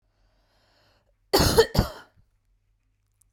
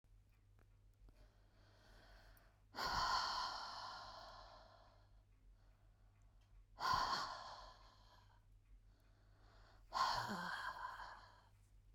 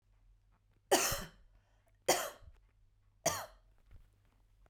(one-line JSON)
{"cough_length": "3.3 s", "cough_amplitude": 18832, "cough_signal_mean_std_ratio": 0.28, "exhalation_length": "11.9 s", "exhalation_amplitude": 1440, "exhalation_signal_mean_std_ratio": 0.49, "three_cough_length": "4.7 s", "three_cough_amplitude": 6952, "three_cough_signal_mean_std_ratio": 0.31, "survey_phase": "beta (2021-08-13 to 2022-03-07)", "age": "45-64", "gender": "Female", "wearing_mask": "No", "symptom_shortness_of_breath": true, "symptom_onset": "8 days", "smoker_status": "Never smoked", "respiratory_condition_asthma": true, "respiratory_condition_other": false, "recruitment_source": "REACT", "submission_delay": "3 days", "covid_test_result": "Negative", "covid_test_method": "RT-qPCR", "influenza_a_test_result": "Negative", "influenza_b_test_result": "Negative"}